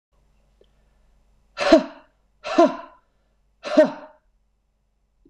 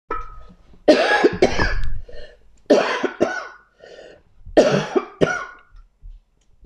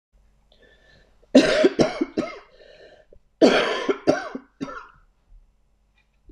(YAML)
exhalation_length: 5.3 s
exhalation_amplitude: 26028
exhalation_signal_mean_std_ratio: 0.27
three_cough_length: 6.7 s
three_cough_amplitude: 26028
three_cough_signal_mean_std_ratio: 0.51
cough_length: 6.3 s
cough_amplitude: 25993
cough_signal_mean_std_ratio: 0.36
survey_phase: beta (2021-08-13 to 2022-03-07)
age: 45-64
gender: Female
wearing_mask: 'No'
symptom_cough_any: true
symptom_fatigue: true
symptom_onset: 7 days
smoker_status: Ex-smoker
respiratory_condition_asthma: false
respiratory_condition_other: false
recruitment_source: REACT
submission_delay: 1 day
covid_test_result: Negative
covid_test_method: RT-qPCR